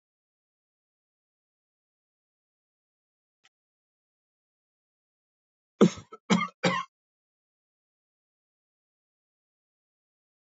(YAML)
cough_length: 10.5 s
cough_amplitude: 15053
cough_signal_mean_std_ratio: 0.14
survey_phase: alpha (2021-03-01 to 2021-08-12)
age: 65+
gender: Male
wearing_mask: 'No'
symptom_cough_any: true
smoker_status: Never smoked
respiratory_condition_asthma: false
respiratory_condition_other: false
recruitment_source: Test and Trace
submission_delay: 1 day
covid_test_result: Positive
covid_test_method: RT-qPCR
covid_ct_value: 23.2
covid_ct_gene: ORF1ab gene
covid_ct_mean: 24.0
covid_viral_load: 14000 copies/ml
covid_viral_load_category: Low viral load (10K-1M copies/ml)